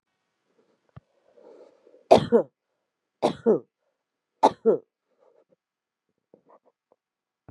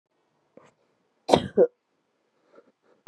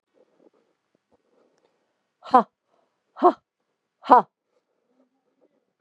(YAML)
three_cough_length: 7.5 s
three_cough_amplitude: 26921
three_cough_signal_mean_std_ratio: 0.22
cough_length: 3.1 s
cough_amplitude: 31247
cough_signal_mean_std_ratio: 0.2
exhalation_length: 5.8 s
exhalation_amplitude: 31186
exhalation_signal_mean_std_ratio: 0.17
survey_phase: beta (2021-08-13 to 2022-03-07)
age: 18-44
gender: Female
wearing_mask: 'No'
symptom_new_continuous_cough: true
symptom_diarrhoea: true
symptom_fatigue: true
symptom_headache: true
smoker_status: Current smoker (1 to 10 cigarettes per day)
respiratory_condition_asthma: false
respiratory_condition_other: false
recruitment_source: Test and Trace
submission_delay: 1 day
covid_test_result: Positive
covid_test_method: LFT